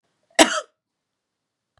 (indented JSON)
{
  "cough_length": "1.8 s",
  "cough_amplitude": 32768,
  "cough_signal_mean_std_ratio": 0.21,
  "survey_phase": "beta (2021-08-13 to 2022-03-07)",
  "age": "45-64",
  "gender": "Female",
  "wearing_mask": "No",
  "symptom_other": true,
  "symptom_onset": "12 days",
  "smoker_status": "Ex-smoker",
  "respiratory_condition_asthma": false,
  "respiratory_condition_other": false,
  "recruitment_source": "REACT",
  "submission_delay": "2 days",
  "covid_test_result": "Negative",
  "covid_test_method": "RT-qPCR",
  "influenza_a_test_result": "Negative",
  "influenza_b_test_result": "Negative"
}